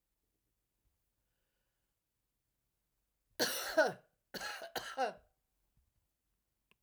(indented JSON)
{
  "cough_length": "6.8 s",
  "cough_amplitude": 4043,
  "cough_signal_mean_std_ratio": 0.27,
  "survey_phase": "alpha (2021-03-01 to 2021-08-12)",
  "age": "65+",
  "gender": "Female",
  "wearing_mask": "No",
  "symptom_none": true,
  "smoker_status": "Never smoked",
  "respiratory_condition_asthma": false,
  "respiratory_condition_other": false,
  "recruitment_source": "REACT",
  "submission_delay": "2 days",
  "covid_test_result": "Negative",
  "covid_test_method": "RT-qPCR"
}